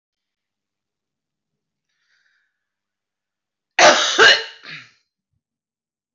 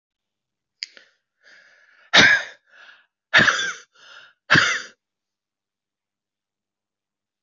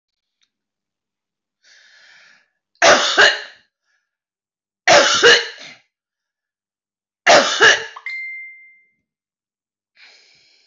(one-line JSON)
{"cough_length": "6.1 s", "cough_amplitude": 25970, "cough_signal_mean_std_ratio": 0.24, "exhalation_length": "7.4 s", "exhalation_amplitude": 26293, "exhalation_signal_mean_std_ratio": 0.28, "three_cough_length": "10.7 s", "three_cough_amplitude": 27270, "three_cough_signal_mean_std_ratio": 0.32, "survey_phase": "beta (2021-08-13 to 2022-03-07)", "age": "45-64", "gender": "Female", "wearing_mask": "No", "symptom_cough_any": true, "symptom_runny_or_blocked_nose": true, "symptom_sore_throat": true, "symptom_fever_high_temperature": true, "symptom_headache": true, "symptom_onset": "2 days", "smoker_status": "Never smoked", "respiratory_condition_asthma": false, "respiratory_condition_other": false, "recruitment_source": "Test and Trace", "submission_delay": "1 day", "covid_test_result": "Positive", "covid_test_method": "RT-qPCR", "covid_ct_value": 31.8, "covid_ct_gene": "ORF1ab gene"}